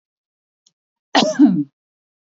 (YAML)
cough_length: 2.4 s
cough_amplitude: 32091
cough_signal_mean_std_ratio: 0.33
survey_phase: beta (2021-08-13 to 2022-03-07)
age: 18-44
gender: Female
wearing_mask: 'No'
symptom_none: true
smoker_status: Never smoked
respiratory_condition_asthma: true
respiratory_condition_other: false
recruitment_source: REACT
submission_delay: 1 day
covid_test_result: Negative
covid_test_method: RT-qPCR
influenza_a_test_result: Negative
influenza_b_test_result: Negative